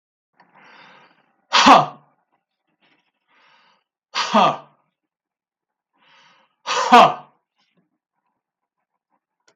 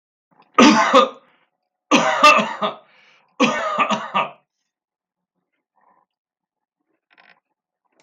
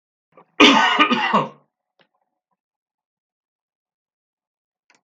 {"exhalation_length": "9.6 s", "exhalation_amplitude": 32768, "exhalation_signal_mean_std_ratio": 0.25, "three_cough_length": "8.0 s", "three_cough_amplitude": 32768, "three_cough_signal_mean_std_ratio": 0.36, "cough_length": "5.0 s", "cough_amplitude": 32768, "cough_signal_mean_std_ratio": 0.3, "survey_phase": "beta (2021-08-13 to 2022-03-07)", "age": "45-64", "gender": "Male", "wearing_mask": "No", "symptom_none": true, "smoker_status": "Never smoked", "respiratory_condition_asthma": false, "respiratory_condition_other": false, "recruitment_source": "REACT", "submission_delay": "3 days", "covid_test_result": "Negative", "covid_test_method": "RT-qPCR", "influenza_a_test_result": "Negative", "influenza_b_test_result": "Negative"}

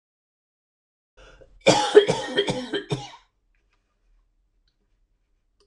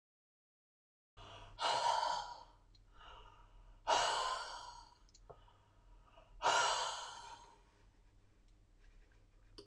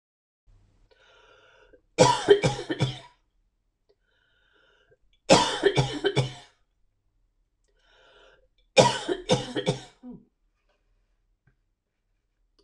{"cough_length": "5.7 s", "cough_amplitude": 26028, "cough_signal_mean_std_ratio": 0.28, "exhalation_length": "9.7 s", "exhalation_amplitude": 3202, "exhalation_signal_mean_std_ratio": 0.43, "three_cough_length": "12.6 s", "three_cough_amplitude": 24504, "three_cough_signal_mean_std_ratio": 0.3, "survey_phase": "beta (2021-08-13 to 2022-03-07)", "age": "45-64", "gender": "Female", "wearing_mask": "No", "symptom_none": true, "smoker_status": "Never smoked", "respiratory_condition_asthma": false, "respiratory_condition_other": false, "recruitment_source": "REACT", "submission_delay": "1 day", "covid_test_result": "Negative", "covid_test_method": "RT-qPCR"}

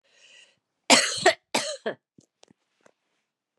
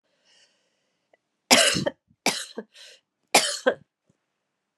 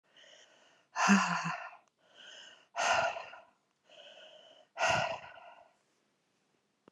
{"cough_length": "3.6 s", "cough_amplitude": 28193, "cough_signal_mean_std_ratio": 0.28, "three_cough_length": "4.8 s", "three_cough_amplitude": 29443, "three_cough_signal_mean_std_ratio": 0.3, "exhalation_length": "6.9 s", "exhalation_amplitude": 8785, "exhalation_signal_mean_std_ratio": 0.39, "survey_phase": "beta (2021-08-13 to 2022-03-07)", "age": "65+", "gender": "Female", "wearing_mask": "No", "symptom_cough_any": true, "symptom_new_continuous_cough": true, "symptom_runny_or_blocked_nose": true, "symptom_sore_throat": true, "symptom_onset": "2 days", "smoker_status": "Never smoked", "respiratory_condition_asthma": false, "respiratory_condition_other": false, "recruitment_source": "Test and Trace", "submission_delay": "1 day", "covid_test_result": "Positive", "covid_test_method": "RT-qPCR", "covid_ct_value": 16.4, "covid_ct_gene": "ORF1ab gene", "covid_ct_mean": 16.9, "covid_viral_load": "2800000 copies/ml", "covid_viral_load_category": "High viral load (>1M copies/ml)"}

